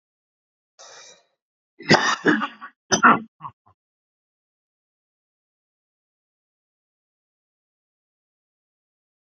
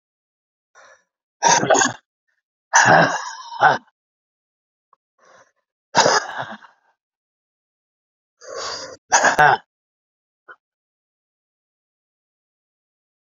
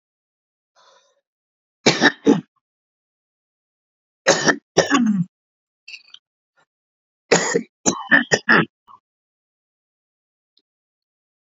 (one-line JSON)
{"cough_length": "9.2 s", "cough_amplitude": 27663, "cough_signal_mean_std_ratio": 0.21, "exhalation_length": "13.4 s", "exhalation_amplitude": 31012, "exhalation_signal_mean_std_ratio": 0.3, "three_cough_length": "11.5 s", "three_cough_amplitude": 32768, "three_cough_signal_mean_std_ratio": 0.3, "survey_phase": "beta (2021-08-13 to 2022-03-07)", "age": "65+", "gender": "Male", "wearing_mask": "No", "symptom_cough_any": true, "symptom_runny_or_blocked_nose": true, "symptom_fever_high_temperature": true, "symptom_change_to_sense_of_smell_or_taste": true, "smoker_status": "Ex-smoker", "respiratory_condition_asthma": true, "respiratory_condition_other": false, "recruitment_source": "Test and Trace", "submission_delay": "1 day", "covid_test_result": "Positive", "covid_test_method": "LFT"}